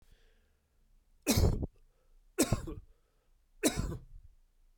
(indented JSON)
{
  "three_cough_length": "4.8 s",
  "three_cough_amplitude": 6669,
  "three_cough_signal_mean_std_ratio": 0.36,
  "survey_phase": "beta (2021-08-13 to 2022-03-07)",
  "age": "45-64",
  "gender": "Male",
  "wearing_mask": "No",
  "symptom_none": true,
  "smoker_status": "Never smoked",
  "respiratory_condition_asthma": true,
  "respiratory_condition_other": false,
  "recruitment_source": "REACT",
  "submission_delay": "1 day",
  "covid_test_result": "Negative",
  "covid_test_method": "RT-qPCR"
}